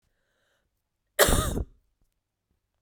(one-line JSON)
{"cough_length": "2.8 s", "cough_amplitude": 23873, "cough_signal_mean_std_ratio": 0.28, "survey_phase": "beta (2021-08-13 to 2022-03-07)", "age": "18-44", "gender": "Female", "wearing_mask": "No", "symptom_cough_any": true, "symptom_runny_or_blocked_nose": true, "symptom_headache": true, "smoker_status": "Never smoked", "respiratory_condition_asthma": false, "respiratory_condition_other": false, "recruitment_source": "Test and Trace", "submission_delay": "2 days", "covid_test_result": "Positive", "covid_test_method": "RT-qPCR", "covid_ct_value": 15.6, "covid_ct_gene": "ORF1ab gene"}